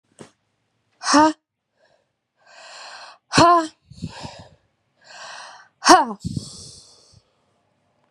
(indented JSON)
{
  "exhalation_length": "8.1 s",
  "exhalation_amplitude": 32767,
  "exhalation_signal_mean_std_ratio": 0.29,
  "survey_phase": "beta (2021-08-13 to 2022-03-07)",
  "age": "18-44",
  "gender": "Female",
  "wearing_mask": "No",
  "symptom_cough_any": true,
  "symptom_runny_or_blocked_nose": true,
  "symptom_shortness_of_breath": true,
  "symptom_abdominal_pain": true,
  "symptom_fatigue": true,
  "symptom_fever_high_temperature": true,
  "symptom_headache": true,
  "symptom_other": true,
  "smoker_status": "Ex-smoker",
  "respiratory_condition_asthma": true,
  "respiratory_condition_other": false,
  "recruitment_source": "Test and Trace",
  "submission_delay": "2 days",
  "covid_test_result": "Positive",
  "covid_test_method": "LFT"
}